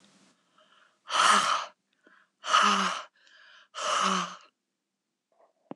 {"exhalation_length": "5.8 s", "exhalation_amplitude": 11809, "exhalation_signal_mean_std_ratio": 0.43, "survey_phase": "beta (2021-08-13 to 2022-03-07)", "age": "45-64", "gender": "Female", "wearing_mask": "No", "symptom_none": true, "smoker_status": "Never smoked", "respiratory_condition_asthma": false, "respiratory_condition_other": false, "recruitment_source": "REACT", "submission_delay": "1 day", "covid_test_method": "RT-qPCR"}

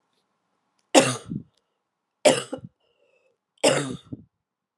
{"three_cough_length": "4.8 s", "three_cough_amplitude": 32508, "three_cough_signal_mean_std_ratio": 0.28, "survey_phase": "beta (2021-08-13 to 2022-03-07)", "age": "45-64", "gender": "Female", "wearing_mask": "No", "symptom_cough_any": true, "symptom_sore_throat": true, "symptom_fatigue": true, "symptom_headache": true, "smoker_status": "Never smoked", "respiratory_condition_asthma": false, "respiratory_condition_other": false, "recruitment_source": "Test and Trace", "submission_delay": "2 days", "covid_test_result": "Positive", "covid_test_method": "ePCR"}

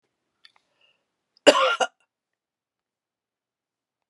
{"cough_length": "4.1 s", "cough_amplitude": 32528, "cough_signal_mean_std_ratio": 0.2, "survey_phase": "beta (2021-08-13 to 2022-03-07)", "age": "45-64", "gender": "Female", "wearing_mask": "No", "symptom_cough_any": true, "symptom_runny_or_blocked_nose": true, "symptom_sore_throat": true, "symptom_fatigue": true, "symptom_headache": true, "symptom_change_to_sense_of_smell_or_taste": true, "symptom_loss_of_taste": true, "smoker_status": "Never smoked", "respiratory_condition_asthma": false, "respiratory_condition_other": false, "recruitment_source": "Test and Trace", "submission_delay": "2 days", "covid_test_result": "Positive", "covid_test_method": "RT-qPCR", "covid_ct_value": 23.6, "covid_ct_gene": "ORF1ab gene"}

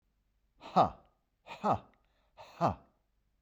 {"exhalation_length": "3.4 s", "exhalation_amplitude": 7382, "exhalation_signal_mean_std_ratio": 0.3, "survey_phase": "beta (2021-08-13 to 2022-03-07)", "age": "18-44", "gender": "Male", "wearing_mask": "No", "symptom_runny_or_blocked_nose": true, "symptom_fatigue": true, "symptom_headache": true, "smoker_status": "Never smoked", "respiratory_condition_asthma": false, "respiratory_condition_other": false, "recruitment_source": "Test and Trace", "submission_delay": "0 days", "covid_test_result": "Negative", "covid_test_method": "LFT"}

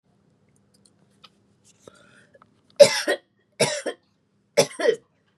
{"three_cough_length": "5.4 s", "three_cough_amplitude": 32614, "three_cough_signal_mean_std_ratio": 0.25, "survey_phase": "beta (2021-08-13 to 2022-03-07)", "age": "18-44", "gender": "Female", "wearing_mask": "No", "symptom_none": true, "smoker_status": "Never smoked", "respiratory_condition_asthma": false, "respiratory_condition_other": false, "recruitment_source": "REACT", "submission_delay": "1 day", "covid_test_result": "Negative", "covid_test_method": "RT-qPCR", "influenza_a_test_result": "Negative", "influenza_b_test_result": "Negative"}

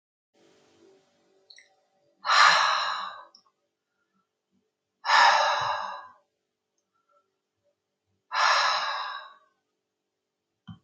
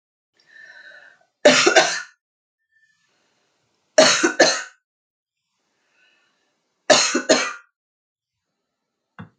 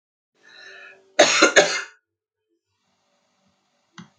{"exhalation_length": "10.8 s", "exhalation_amplitude": 17238, "exhalation_signal_mean_std_ratio": 0.36, "three_cough_length": "9.4 s", "three_cough_amplitude": 31407, "three_cough_signal_mean_std_ratio": 0.31, "cough_length": "4.2 s", "cough_amplitude": 30645, "cough_signal_mean_std_ratio": 0.28, "survey_phase": "alpha (2021-03-01 to 2021-08-12)", "age": "65+", "gender": "Female", "wearing_mask": "No", "symptom_none": true, "smoker_status": "Current smoker (e-cigarettes or vapes only)", "respiratory_condition_asthma": false, "respiratory_condition_other": false, "recruitment_source": "REACT", "submission_delay": "2 days", "covid_test_result": "Negative", "covid_test_method": "RT-qPCR"}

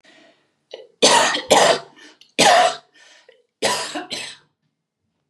{"cough_length": "5.3 s", "cough_amplitude": 31304, "cough_signal_mean_std_ratio": 0.42, "survey_phase": "beta (2021-08-13 to 2022-03-07)", "age": "45-64", "gender": "Female", "wearing_mask": "No", "symptom_none": true, "smoker_status": "Never smoked", "respiratory_condition_asthma": false, "respiratory_condition_other": false, "recruitment_source": "REACT", "submission_delay": "1 day", "covid_test_result": "Negative", "covid_test_method": "RT-qPCR"}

